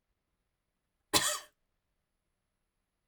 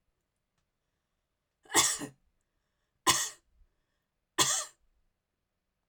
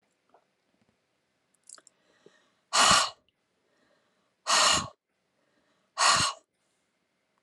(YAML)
cough_length: 3.1 s
cough_amplitude: 10458
cough_signal_mean_std_ratio: 0.21
three_cough_length: 5.9 s
three_cough_amplitude: 11305
three_cough_signal_mean_std_ratio: 0.27
exhalation_length: 7.4 s
exhalation_amplitude: 12548
exhalation_signal_mean_std_ratio: 0.3
survey_phase: alpha (2021-03-01 to 2021-08-12)
age: 45-64
gender: Female
wearing_mask: 'No'
symptom_none: true
smoker_status: Never smoked
respiratory_condition_asthma: false
respiratory_condition_other: false
recruitment_source: REACT
submission_delay: 1 day
covid_test_result: Negative
covid_test_method: RT-qPCR